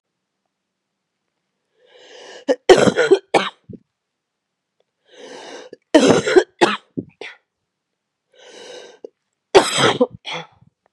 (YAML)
three_cough_length: 10.9 s
three_cough_amplitude: 32768
three_cough_signal_mean_std_ratio: 0.31
survey_phase: beta (2021-08-13 to 2022-03-07)
age: 18-44
gender: Female
wearing_mask: 'No'
symptom_cough_any: true
symptom_runny_or_blocked_nose: true
smoker_status: Ex-smoker
respiratory_condition_asthma: false
respiratory_condition_other: false
recruitment_source: Test and Trace
submission_delay: 1 day
covid_test_result: Positive
covid_test_method: LFT